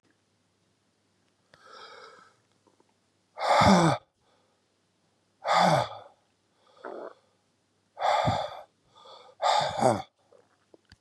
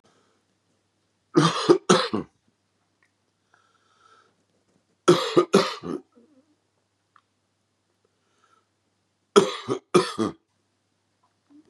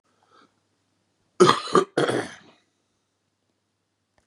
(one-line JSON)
{"exhalation_length": "11.0 s", "exhalation_amplitude": 16702, "exhalation_signal_mean_std_ratio": 0.36, "three_cough_length": "11.7 s", "three_cough_amplitude": 27633, "three_cough_signal_mean_std_ratio": 0.27, "cough_length": "4.3 s", "cough_amplitude": 31382, "cough_signal_mean_std_ratio": 0.27, "survey_phase": "beta (2021-08-13 to 2022-03-07)", "age": "45-64", "gender": "Male", "wearing_mask": "No", "symptom_cough_any": true, "symptom_runny_or_blocked_nose": true, "symptom_sore_throat": true, "symptom_fatigue": true, "symptom_fever_high_temperature": true, "symptom_headache": true, "symptom_onset": "4 days", "smoker_status": "Ex-smoker", "respiratory_condition_asthma": false, "respiratory_condition_other": false, "recruitment_source": "Test and Trace", "submission_delay": "2 days", "covid_test_result": "Positive", "covid_test_method": "RT-qPCR", "covid_ct_value": 19.3, "covid_ct_gene": "N gene"}